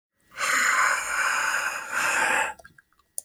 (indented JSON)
{
  "exhalation_length": "3.2 s",
  "exhalation_amplitude": 11850,
  "exhalation_signal_mean_std_ratio": 0.78,
  "survey_phase": "beta (2021-08-13 to 2022-03-07)",
  "age": "45-64",
  "gender": "Male",
  "wearing_mask": "No",
  "symptom_none": true,
  "smoker_status": "Never smoked",
  "respiratory_condition_asthma": false,
  "respiratory_condition_other": false,
  "recruitment_source": "REACT",
  "submission_delay": "1 day",
  "covid_test_result": "Negative",
  "covid_test_method": "RT-qPCR"
}